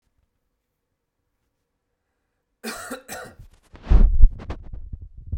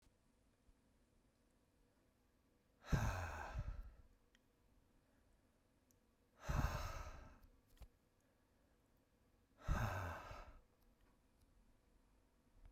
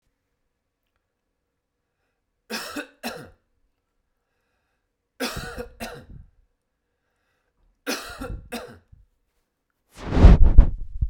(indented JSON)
{
  "cough_length": "5.4 s",
  "cough_amplitude": 32768,
  "cough_signal_mean_std_ratio": 0.26,
  "exhalation_length": "12.7 s",
  "exhalation_amplitude": 1758,
  "exhalation_signal_mean_std_ratio": 0.36,
  "three_cough_length": "11.1 s",
  "three_cough_amplitude": 32768,
  "three_cough_signal_mean_std_ratio": 0.22,
  "survey_phase": "beta (2021-08-13 to 2022-03-07)",
  "age": "18-44",
  "gender": "Male",
  "wearing_mask": "No",
  "symptom_cough_any": true,
  "symptom_runny_or_blocked_nose": true,
  "smoker_status": "Never smoked",
  "respiratory_condition_asthma": false,
  "respiratory_condition_other": false,
  "recruitment_source": "Test and Trace",
  "submission_delay": "2 days",
  "covid_test_result": "Positive",
  "covid_test_method": "RT-qPCR"
}